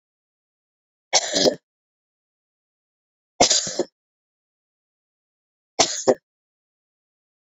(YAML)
three_cough_length: 7.4 s
three_cough_amplitude: 27474
three_cough_signal_mean_std_ratio: 0.25
survey_phase: beta (2021-08-13 to 2022-03-07)
age: 18-44
gender: Female
wearing_mask: 'No'
symptom_cough_any: true
symptom_new_continuous_cough: true
symptom_fatigue: true
symptom_fever_high_temperature: true
symptom_headache: true
symptom_change_to_sense_of_smell_or_taste: true
symptom_loss_of_taste: true
smoker_status: Never smoked
respiratory_condition_asthma: true
respiratory_condition_other: false
recruitment_source: Test and Trace
submission_delay: 2 days
covid_test_result: Negative
covid_test_method: LAMP